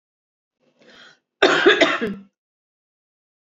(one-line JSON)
{"cough_length": "3.4 s", "cough_amplitude": 28708, "cough_signal_mean_std_ratio": 0.33, "survey_phase": "beta (2021-08-13 to 2022-03-07)", "age": "45-64", "gender": "Female", "wearing_mask": "Yes", "symptom_none": true, "smoker_status": "Ex-smoker", "respiratory_condition_asthma": false, "respiratory_condition_other": false, "recruitment_source": "REACT", "submission_delay": "7 days", "covid_test_result": "Negative", "covid_test_method": "RT-qPCR", "influenza_a_test_result": "Negative", "influenza_b_test_result": "Negative"}